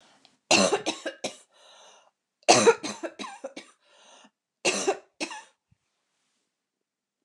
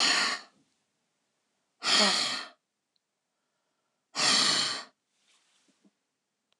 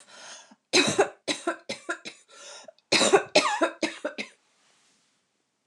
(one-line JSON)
{"three_cough_length": "7.2 s", "three_cough_amplitude": 28262, "three_cough_signal_mean_std_ratio": 0.31, "exhalation_length": "6.6 s", "exhalation_amplitude": 9956, "exhalation_signal_mean_std_ratio": 0.4, "cough_length": "5.7 s", "cough_amplitude": 20562, "cough_signal_mean_std_ratio": 0.39, "survey_phase": "alpha (2021-03-01 to 2021-08-12)", "age": "65+", "gender": "Female", "wearing_mask": "No", "symptom_none": true, "smoker_status": "Never smoked", "respiratory_condition_asthma": false, "respiratory_condition_other": false, "recruitment_source": "REACT", "submission_delay": "1 day", "covid_test_result": "Negative", "covid_test_method": "RT-qPCR"}